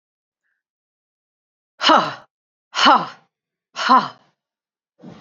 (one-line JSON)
{"exhalation_length": "5.2 s", "exhalation_amplitude": 28252, "exhalation_signal_mean_std_ratio": 0.3, "survey_phase": "beta (2021-08-13 to 2022-03-07)", "age": "45-64", "gender": "Female", "wearing_mask": "No", "symptom_cough_any": true, "symptom_runny_or_blocked_nose": true, "symptom_other": true, "smoker_status": "Never smoked", "respiratory_condition_asthma": false, "respiratory_condition_other": false, "recruitment_source": "Test and Trace", "submission_delay": "2 days", "covid_test_result": "Positive", "covid_test_method": "LFT"}